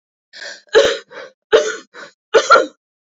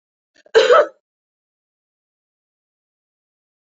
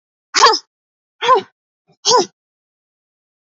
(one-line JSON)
{"three_cough_length": "3.1 s", "three_cough_amplitude": 32767, "three_cough_signal_mean_std_ratio": 0.4, "cough_length": "3.7 s", "cough_amplitude": 29252, "cough_signal_mean_std_ratio": 0.23, "exhalation_length": "3.4 s", "exhalation_amplitude": 32767, "exhalation_signal_mean_std_ratio": 0.33, "survey_phase": "beta (2021-08-13 to 2022-03-07)", "age": "45-64", "gender": "Female", "wearing_mask": "No", "symptom_new_continuous_cough": true, "symptom_runny_or_blocked_nose": true, "symptom_headache": true, "symptom_onset": "3 days", "smoker_status": "Ex-smoker", "respiratory_condition_asthma": true, "respiratory_condition_other": false, "recruitment_source": "Test and Trace", "submission_delay": "1 day", "covid_test_result": "Positive", "covid_test_method": "RT-qPCR", "covid_ct_value": 24.1, "covid_ct_gene": "N gene"}